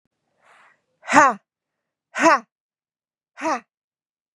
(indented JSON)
{
  "exhalation_length": "4.4 s",
  "exhalation_amplitude": 32485,
  "exhalation_signal_mean_std_ratio": 0.27,
  "survey_phase": "beta (2021-08-13 to 2022-03-07)",
  "age": "45-64",
  "gender": "Female",
  "wearing_mask": "No",
  "symptom_none": true,
  "smoker_status": "Never smoked",
  "respiratory_condition_asthma": false,
  "respiratory_condition_other": false,
  "recruitment_source": "REACT",
  "submission_delay": "1 day",
  "covid_test_result": "Negative",
  "covid_test_method": "RT-qPCR",
  "influenza_a_test_result": "Negative",
  "influenza_b_test_result": "Negative"
}